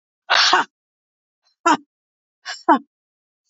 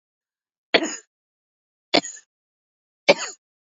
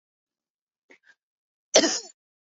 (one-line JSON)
{"exhalation_length": "3.5 s", "exhalation_amplitude": 27590, "exhalation_signal_mean_std_ratio": 0.32, "three_cough_length": "3.7 s", "three_cough_amplitude": 29184, "three_cough_signal_mean_std_ratio": 0.21, "cough_length": "2.6 s", "cough_amplitude": 26456, "cough_signal_mean_std_ratio": 0.22, "survey_phase": "beta (2021-08-13 to 2022-03-07)", "age": "45-64", "gender": "Female", "wearing_mask": "No", "symptom_none": true, "smoker_status": "Never smoked", "respiratory_condition_asthma": true, "respiratory_condition_other": false, "recruitment_source": "REACT", "submission_delay": "2 days", "covid_test_result": "Negative", "covid_test_method": "RT-qPCR", "influenza_a_test_result": "Negative", "influenza_b_test_result": "Negative"}